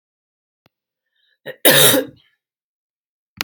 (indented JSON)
{
  "cough_length": "3.4 s",
  "cough_amplitude": 32768,
  "cough_signal_mean_std_ratio": 0.28,
  "survey_phase": "beta (2021-08-13 to 2022-03-07)",
  "age": "18-44",
  "gender": "Female",
  "wearing_mask": "No",
  "symptom_cough_any": true,
  "symptom_runny_or_blocked_nose": true,
  "symptom_fatigue": true,
  "symptom_headache": true,
  "symptom_change_to_sense_of_smell_or_taste": true,
  "symptom_loss_of_taste": true,
  "symptom_onset": "4 days",
  "smoker_status": "Never smoked",
  "respiratory_condition_asthma": false,
  "respiratory_condition_other": false,
  "recruitment_source": "Test and Trace",
  "submission_delay": "2 days",
  "covid_test_result": "Positive",
  "covid_test_method": "RT-qPCR",
  "covid_ct_value": 20.3,
  "covid_ct_gene": "ORF1ab gene",
  "covid_ct_mean": 21.3,
  "covid_viral_load": "100000 copies/ml",
  "covid_viral_load_category": "Low viral load (10K-1M copies/ml)"
}